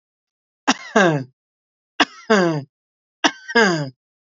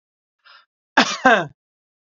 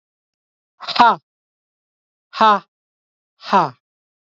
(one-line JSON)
{"three_cough_length": "4.4 s", "three_cough_amplitude": 29279, "three_cough_signal_mean_std_ratio": 0.39, "cough_length": "2.0 s", "cough_amplitude": 28086, "cough_signal_mean_std_ratio": 0.31, "exhalation_length": "4.3 s", "exhalation_amplitude": 27937, "exhalation_signal_mean_std_ratio": 0.29, "survey_phase": "beta (2021-08-13 to 2022-03-07)", "age": "18-44", "gender": "Male", "wearing_mask": "No", "symptom_none": true, "smoker_status": "Never smoked", "respiratory_condition_asthma": false, "respiratory_condition_other": false, "recruitment_source": "REACT", "submission_delay": "3 days", "covid_test_result": "Negative", "covid_test_method": "RT-qPCR", "influenza_a_test_result": "Negative", "influenza_b_test_result": "Negative"}